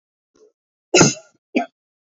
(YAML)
cough_length: 2.1 s
cough_amplitude: 30166
cough_signal_mean_std_ratio: 0.28
survey_phase: beta (2021-08-13 to 2022-03-07)
age: 18-44
gender: Female
wearing_mask: 'No'
symptom_cough_any: true
symptom_shortness_of_breath: true
symptom_sore_throat: true
symptom_fatigue: true
symptom_headache: true
symptom_onset: 4 days
smoker_status: Never smoked
respiratory_condition_asthma: false
respiratory_condition_other: false
recruitment_source: Test and Trace
submission_delay: 1 day
covid_test_result: Positive
covid_test_method: RT-qPCR
covid_ct_value: 27.7
covid_ct_gene: N gene